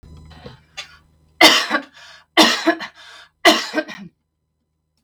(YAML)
three_cough_length: 5.0 s
three_cough_amplitude: 32768
three_cough_signal_mean_std_ratio: 0.35
survey_phase: beta (2021-08-13 to 2022-03-07)
age: 45-64
gender: Female
wearing_mask: 'No'
symptom_none: true
smoker_status: Never smoked
respiratory_condition_asthma: false
respiratory_condition_other: false
recruitment_source: REACT
submission_delay: 1 day
covid_test_result: Negative
covid_test_method: RT-qPCR
influenza_a_test_result: Negative
influenza_b_test_result: Negative